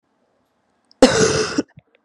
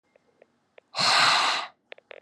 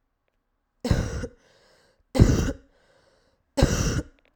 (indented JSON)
{
  "cough_length": "2.0 s",
  "cough_amplitude": 32767,
  "cough_signal_mean_std_ratio": 0.37,
  "exhalation_length": "2.2 s",
  "exhalation_amplitude": 14038,
  "exhalation_signal_mean_std_ratio": 0.48,
  "three_cough_length": "4.4 s",
  "three_cough_amplitude": 32768,
  "three_cough_signal_mean_std_ratio": 0.37,
  "survey_phase": "alpha (2021-03-01 to 2021-08-12)",
  "age": "18-44",
  "gender": "Female",
  "wearing_mask": "No",
  "symptom_cough_any": true,
  "symptom_new_continuous_cough": true,
  "symptom_shortness_of_breath": true,
  "symptom_fatigue": true,
  "symptom_fever_high_temperature": true,
  "symptom_headache": true,
  "symptom_onset": "2 days",
  "smoker_status": "Never smoked",
  "respiratory_condition_asthma": false,
  "respiratory_condition_other": false,
  "recruitment_source": "Test and Trace",
  "submission_delay": "2 days",
  "covid_test_result": "Positive",
  "covid_test_method": "RT-qPCR",
  "covid_ct_value": 16.8,
  "covid_ct_gene": "ORF1ab gene",
  "covid_ct_mean": 17.9,
  "covid_viral_load": "1400000 copies/ml",
  "covid_viral_load_category": "High viral load (>1M copies/ml)"
}